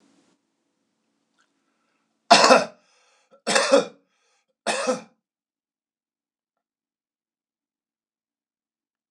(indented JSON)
{
  "three_cough_length": "9.1 s",
  "three_cough_amplitude": 26028,
  "three_cough_signal_mean_std_ratio": 0.23,
  "survey_phase": "beta (2021-08-13 to 2022-03-07)",
  "age": "65+",
  "gender": "Male",
  "wearing_mask": "No",
  "symptom_cough_any": true,
  "symptom_runny_or_blocked_nose": true,
  "smoker_status": "Never smoked",
  "respiratory_condition_asthma": false,
  "respiratory_condition_other": false,
  "recruitment_source": "REACT",
  "submission_delay": "0 days",
  "covid_test_result": "Negative",
  "covid_test_method": "RT-qPCR",
  "influenza_a_test_result": "Negative",
  "influenza_b_test_result": "Negative"
}